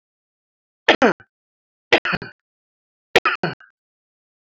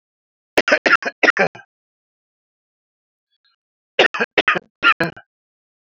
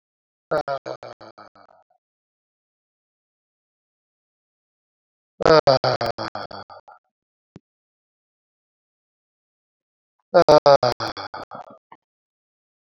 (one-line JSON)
{"three_cough_length": "4.6 s", "three_cough_amplitude": 32768, "three_cough_signal_mean_std_ratio": 0.25, "cough_length": "5.9 s", "cough_amplitude": 32768, "cough_signal_mean_std_ratio": 0.3, "exhalation_length": "12.8 s", "exhalation_amplitude": 28021, "exhalation_signal_mean_std_ratio": 0.23, "survey_phase": "beta (2021-08-13 to 2022-03-07)", "age": "45-64", "gender": "Male", "wearing_mask": "No", "symptom_none": true, "symptom_onset": "12 days", "smoker_status": "Never smoked", "respiratory_condition_asthma": true, "respiratory_condition_other": false, "recruitment_source": "REACT", "submission_delay": "2 days", "covid_test_result": "Negative", "covid_test_method": "RT-qPCR", "influenza_a_test_result": "Negative", "influenza_b_test_result": "Negative"}